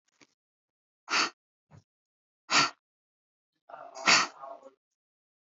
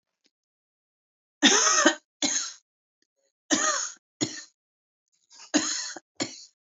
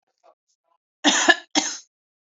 {"exhalation_length": "5.5 s", "exhalation_amplitude": 12715, "exhalation_signal_mean_std_ratio": 0.27, "three_cough_length": "6.7 s", "three_cough_amplitude": 18984, "three_cough_signal_mean_std_ratio": 0.37, "cough_length": "2.3 s", "cough_amplitude": 28962, "cough_signal_mean_std_ratio": 0.33, "survey_phase": "beta (2021-08-13 to 2022-03-07)", "age": "45-64", "gender": "Female", "wearing_mask": "No", "symptom_headache": true, "smoker_status": "Ex-smoker", "respiratory_condition_asthma": false, "respiratory_condition_other": false, "recruitment_source": "REACT", "submission_delay": "2 days", "covid_test_result": "Negative", "covid_test_method": "RT-qPCR", "influenza_a_test_result": "Negative", "influenza_b_test_result": "Negative"}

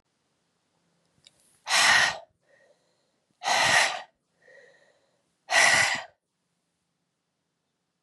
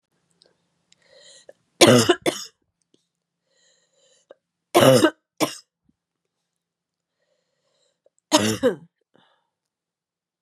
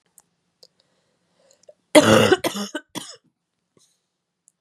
{"exhalation_length": "8.0 s", "exhalation_amplitude": 15258, "exhalation_signal_mean_std_ratio": 0.35, "three_cough_length": "10.4 s", "three_cough_amplitude": 32767, "three_cough_signal_mean_std_ratio": 0.25, "cough_length": "4.6 s", "cough_amplitude": 31757, "cough_signal_mean_std_ratio": 0.26, "survey_phase": "beta (2021-08-13 to 2022-03-07)", "age": "45-64", "gender": "Female", "wearing_mask": "No", "symptom_cough_any": true, "symptom_runny_or_blocked_nose": true, "symptom_fatigue": true, "symptom_fever_high_temperature": true, "symptom_headache": true, "symptom_change_to_sense_of_smell_or_taste": true, "symptom_loss_of_taste": true, "smoker_status": "Never smoked", "respiratory_condition_asthma": false, "respiratory_condition_other": false, "recruitment_source": "Test and Trace", "submission_delay": "2 days", "covid_test_result": "Positive", "covid_test_method": "ePCR"}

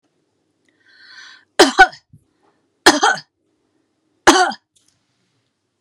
{"three_cough_length": "5.8 s", "three_cough_amplitude": 32768, "three_cough_signal_mean_std_ratio": 0.26, "survey_phase": "beta (2021-08-13 to 2022-03-07)", "age": "65+", "gender": "Female", "wearing_mask": "No", "symptom_none": true, "smoker_status": "Ex-smoker", "respiratory_condition_asthma": true, "respiratory_condition_other": false, "recruitment_source": "REACT", "submission_delay": "2 days", "covid_test_result": "Negative", "covid_test_method": "RT-qPCR"}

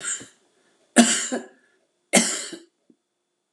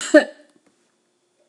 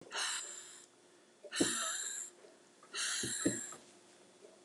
{"three_cough_length": "3.5 s", "three_cough_amplitude": 30360, "three_cough_signal_mean_std_ratio": 0.34, "cough_length": "1.5 s", "cough_amplitude": 31474, "cough_signal_mean_std_ratio": 0.23, "exhalation_length": "4.6 s", "exhalation_amplitude": 4525, "exhalation_signal_mean_std_ratio": 0.59, "survey_phase": "beta (2021-08-13 to 2022-03-07)", "age": "65+", "gender": "Female", "wearing_mask": "No", "symptom_fatigue": true, "smoker_status": "Never smoked", "respiratory_condition_asthma": true, "respiratory_condition_other": true, "recruitment_source": "REACT", "submission_delay": "3 days", "covid_test_result": "Negative", "covid_test_method": "RT-qPCR"}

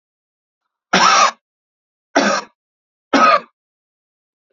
{"three_cough_length": "4.5 s", "three_cough_amplitude": 32767, "three_cough_signal_mean_std_ratio": 0.37, "survey_phase": "alpha (2021-03-01 to 2021-08-12)", "age": "45-64", "gender": "Male", "wearing_mask": "No", "symptom_cough_any": true, "symptom_diarrhoea": true, "symptom_fatigue": true, "symptom_headache": true, "symptom_change_to_sense_of_smell_or_taste": true, "symptom_onset": "6 days", "smoker_status": "Never smoked", "respiratory_condition_asthma": false, "respiratory_condition_other": false, "recruitment_source": "Test and Trace", "submission_delay": "2 days", "covid_test_result": "Positive", "covid_test_method": "RT-qPCR", "covid_ct_value": 24.4, "covid_ct_gene": "S gene", "covid_ct_mean": 24.5, "covid_viral_load": "9000 copies/ml", "covid_viral_load_category": "Minimal viral load (< 10K copies/ml)"}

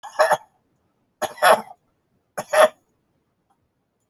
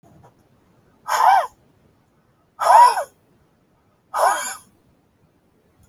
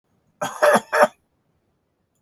{"three_cough_length": "4.1 s", "three_cough_amplitude": 27863, "three_cough_signal_mean_std_ratio": 0.3, "exhalation_length": "5.9 s", "exhalation_amplitude": 27429, "exhalation_signal_mean_std_ratio": 0.34, "cough_length": "2.2 s", "cough_amplitude": 28124, "cough_signal_mean_std_ratio": 0.34, "survey_phase": "beta (2021-08-13 to 2022-03-07)", "age": "45-64", "gender": "Male", "wearing_mask": "No", "symptom_fatigue": true, "smoker_status": "Ex-smoker", "respiratory_condition_asthma": false, "respiratory_condition_other": true, "recruitment_source": "Test and Trace", "submission_delay": "2 days", "covid_test_result": "Positive", "covid_test_method": "ePCR"}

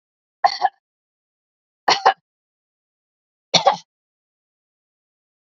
{"three_cough_length": "5.5 s", "three_cough_amplitude": 31978, "three_cough_signal_mean_std_ratio": 0.22, "survey_phase": "beta (2021-08-13 to 2022-03-07)", "age": "65+", "gender": "Female", "wearing_mask": "No", "symptom_none": true, "smoker_status": "Never smoked", "respiratory_condition_asthma": false, "respiratory_condition_other": false, "recruitment_source": "REACT", "submission_delay": "1 day", "covid_test_result": "Negative", "covid_test_method": "RT-qPCR", "influenza_a_test_result": "Negative", "influenza_b_test_result": "Negative"}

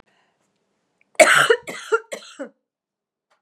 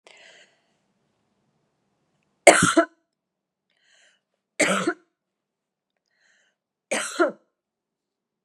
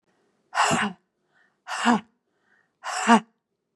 {"cough_length": "3.4 s", "cough_amplitude": 32767, "cough_signal_mean_std_ratio": 0.29, "three_cough_length": "8.4 s", "three_cough_amplitude": 32768, "three_cough_signal_mean_std_ratio": 0.22, "exhalation_length": "3.8 s", "exhalation_amplitude": 25714, "exhalation_signal_mean_std_ratio": 0.36, "survey_phase": "beta (2021-08-13 to 2022-03-07)", "age": "65+", "gender": "Female", "wearing_mask": "No", "symptom_cough_any": true, "symptom_runny_or_blocked_nose": true, "symptom_sore_throat": true, "symptom_abdominal_pain": true, "symptom_headache": true, "symptom_onset": "4 days", "smoker_status": "Ex-smoker", "respiratory_condition_asthma": false, "respiratory_condition_other": false, "recruitment_source": "Test and Trace", "submission_delay": "2 days", "covid_test_result": "Positive", "covid_test_method": "RT-qPCR", "covid_ct_value": 16.6, "covid_ct_gene": "ORF1ab gene", "covid_ct_mean": 16.7, "covid_viral_load": "3300000 copies/ml", "covid_viral_load_category": "High viral load (>1M copies/ml)"}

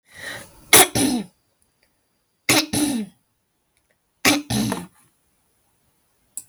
{"three_cough_length": "6.5 s", "three_cough_amplitude": 32768, "three_cough_signal_mean_std_ratio": 0.34, "survey_phase": "beta (2021-08-13 to 2022-03-07)", "age": "45-64", "gender": "Female", "wearing_mask": "No", "symptom_none": true, "smoker_status": "Ex-smoker", "respiratory_condition_asthma": false, "respiratory_condition_other": false, "recruitment_source": "REACT", "submission_delay": "0 days", "covid_test_result": "Negative", "covid_test_method": "RT-qPCR"}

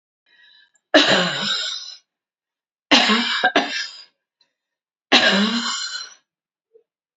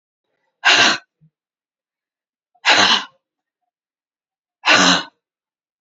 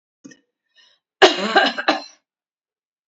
{"three_cough_length": "7.2 s", "three_cough_amplitude": 32537, "three_cough_signal_mean_std_ratio": 0.46, "exhalation_length": "5.8 s", "exhalation_amplitude": 31068, "exhalation_signal_mean_std_ratio": 0.34, "cough_length": "3.1 s", "cough_amplitude": 28963, "cough_signal_mean_std_ratio": 0.31, "survey_phase": "beta (2021-08-13 to 2022-03-07)", "age": "65+", "gender": "Female", "wearing_mask": "No", "symptom_cough_any": true, "symptom_sore_throat": true, "symptom_onset": "6 days", "smoker_status": "Ex-smoker", "respiratory_condition_asthma": false, "respiratory_condition_other": false, "recruitment_source": "REACT", "submission_delay": "3 days", "covid_test_result": "Negative", "covid_test_method": "RT-qPCR", "influenza_a_test_result": "Negative", "influenza_b_test_result": "Negative"}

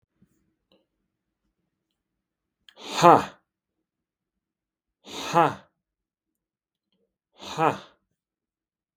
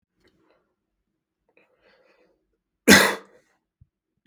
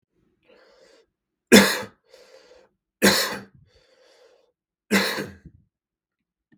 {"exhalation_length": "9.0 s", "exhalation_amplitude": 32766, "exhalation_signal_mean_std_ratio": 0.18, "cough_length": "4.3 s", "cough_amplitude": 32768, "cough_signal_mean_std_ratio": 0.18, "three_cough_length": "6.6 s", "three_cough_amplitude": 32768, "three_cough_signal_mean_std_ratio": 0.26, "survey_phase": "beta (2021-08-13 to 2022-03-07)", "age": "18-44", "gender": "Male", "wearing_mask": "No", "symptom_new_continuous_cough": true, "symptom_onset": "4 days", "smoker_status": "Never smoked", "respiratory_condition_asthma": false, "respiratory_condition_other": false, "recruitment_source": "Test and Trace", "submission_delay": "2 days", "covid_test_result": "Positive", "covid_test_method": "RT-qPCR", "covid_ct_value": 32.0, "covid_ct_gene": "N gene"}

